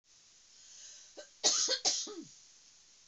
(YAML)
cough_length: 3.1 s
cough_amplitude: 5766
cough_signal_mean_std_ratio: 0.41
survey_phase: beta (2021-08-13 to 2022-03-07)
age: 65+
gender: Female
wearing_mask: 'No'
symptom_none: true
smoker_status: Never smoked
respiratory_condition_asthma: false
respiratory_condition_other: false
recruitment_source: REACT
submission_delay: 2 days
covid_test_result: Negative
covid_test_method: RT-qPCR
influenza_a_test_result: Negative
influenza_b_test_result: Negative